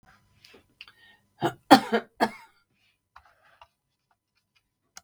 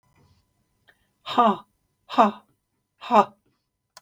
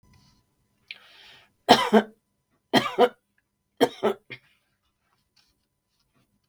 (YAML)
cough_length: 5.0 s
cough_amplitude: 32766
cough_signal_mean_std_ratio: 0.18
exhalation_length: 4.0 s
exhalation_amplitude: 27207
exhalation_signal_mean_std_ratio: 0.28
three_cough_length: 6.5 s
three_cough_amplitude: 32768
three_cough_signal_mean_std_ratio: 0.25
survey_phase: beta (2021-08-13 to 2022-03-07)
age: 65+
gender: Female
wearing_mask: 'No'
symptom_none: true
smoker_status: Never smoked
respiratory_condition_asthma: false
respiratory_condition_other: false
recruitment_source: REACT
submission_delay: 2 days
covid_test_result: Negative
covid_test_method: RT-qPCR
influenza_a_test_result: Negative
influenza_b_test_result: Negative